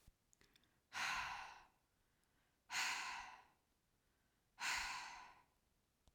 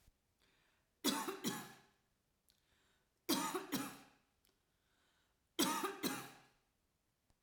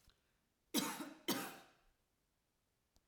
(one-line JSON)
{"exhalation_length": "6.1 s", "exhalation_amplitude": 1038, "exhalation_signal_mean_std_ratio": 0.46, "three_cough_length": "7.4 s", "three_cough_amplitude": 2650, "three_cough_signal_mean_std_ratio": 0.38, "cough_length": "3.1 s", "cough_amplitude": 2650, "cough_signal_mean_std_ratio": 0.34, "survey_phase": "alpha (2021-03-01 to 2021-08-12)", "age": "18-44", "gender": "Female", "wearing_mask": "No", "symptom_none": true, "smoker_status": "Ex-smoker", "respiratory_condition_asthma": true, "respiratory_condition_other": false, "recruitment_source": "REACT", "submission_delay": "1 day", "covid_test_result": "Negative", "covid_test_method": "RT-qPCR"}